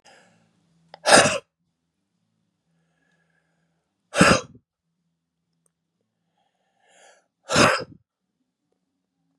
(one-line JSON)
{"exhalation_length": "9.4 s", "exhalation_amplitude": 32341, "exhalation_signal_mean_std_ratio": 0.23, "survey_phase": "beta (2021-08-13 to 2022-03-07)", "age": "45-64", "gender": "Male", "wearing_mask": "No", "symptom_cough_any": true, "smoker_status": "Never smoked", "respiratory_condition_asthma": false, "respiratory_condition_other": false, "recruitment_source": "Test and Trace", "submission_delay": "1 day", "covid_test_result": "Negative", "covid_test_method": "RT-qPCR"}